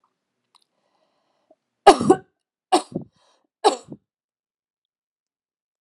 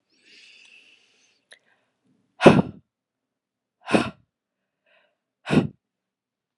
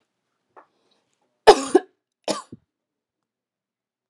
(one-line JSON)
{"three_cough_length": "5.8 s", "three_cough_amplitude": 32767, "three_cough_signal_mean_std_ratio": 0.19, "exhalation_length": "6.6 s", "exhalation_amplitude": 32768, "exhalation_signal_mean_std_ratio": 0.2, "cough_length": "4.1 s", "cough_amplitude": 32767, "cough_signal_mean_std_ratio": 0.17, "survey_phase": "alpha (2021-03-01 to 2021-08-12)", "age": "18-44", "gender": "Female", "wearing_mask": "No", "symptom_none": true, "symptom_onset": "4 days", "smoker_status": "Ex-smoker", "respiratory_condition_asthma": false, "respiratory_condition_other": false, "recruitment_source": "REACT", "submission_delay": "2 days", "covid_test_result": "Negative", "covid_test_method": "RT-qPCR"}